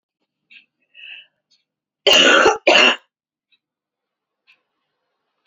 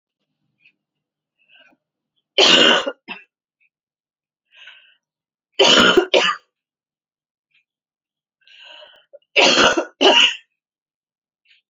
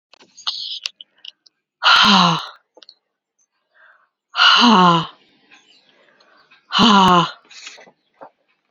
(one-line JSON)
{"cough_length": "5.5 s", "cough_amplitude": 32768, "cough_signal_mean_std_ratio": 0.31, "three_cough_length": "11.7 s", "three_cough_amplitude": 32767, "three_cough_signal_mean_std_ratio": 0.33, "exhalation_length": "8.7 s", "exhalation_amplitude": 32767, "exhalation_signal_mean_std_ratio": 0.4, "survey_phase": "beta (2021-08-13 to 2022-03-07)", "age": "18-44", "gender": "Female", "wearing_mask": "No", "symptom_cough_any": true, "symptom_runny_or_blocked_nose": true, "symptom_shortness_of_breath": true, "symptom_sore_throat": true, "symptom_fatigue": true, "symptom_headache": true, "symptom_change_to_sense_of_smell_or_taste": true, "symptom_onset": "3 days", "smoker_status": "Never smoked", "respiratory_condition_asthma": true, "respiratory_condition_other": false, "recruitment_source": "Test and Trace", "submission_delay": "1 day", "covid_test_result": "Positive", "covid_test_method": "ePCR"}